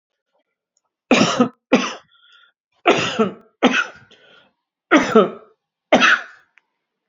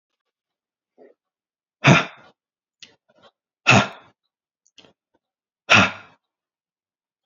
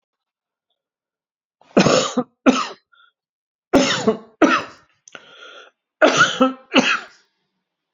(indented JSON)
{
  "cough_length": "7.1 s",
  "cough_amplitude": 30863,
  "cough_signal_mean_std_ratio": 0.38,
  "exhalation_length": "7.3 s",
  "exhalation_amplitude": 29078,
  "exhalation_signal_mean_std_ratio": 0.22,
  "three_cough_length": "7.9 s",
  "three_cough_amplitude": 32768,
  "three_cough_signal_mean_std_ratio": 0.38,
  "survey_phase": "beta (2021-08-13 to 2022-03-07)",
  "age": "45-64",
  "gender": "Male",
  "wearing_mask": "No",
  "symptom_none": true,
  "smoker_status": "Ex-smoker",
  "respiratory_condition_asthma": false,
  "respiratory_condition_other": false,
  "recruitment_source": "REACT",
  "submission_delay": "3 days",
  "covid_test_result": "Negative",
  "covid_test_method": "RT-qPCR"
}